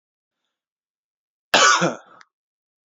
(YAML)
cough_length: 3.0 s
cough_amplitude: 27871
cough_signal_mean_std_ratio: 0.28
survey_phase: beta (2021-08-13 to 2022-03-07)
age: 18-44
gender: Male
wearing_mask: 'No'
symptom_fatigue: true
symptom_fever_high_temperature: true
symptom_headache: true
symptom_onset: 3 days
smoker_status: Never smoked
respiratory_condition_asthma: false
respiratory_condition_other: false
recruitment_source: Test and Trace
submission_delay: 1 day
covid_test_result: Positive
covid_test_method: RT-qPCR
covid_ct_value: 24.2
covid_ct_gene: ORF1ab gene
covid_ct_mean: 26.8
covid_viral_load: 1600 copies/ml
covid_viral_load_category: Minimal viral load (< 10K copies/ml)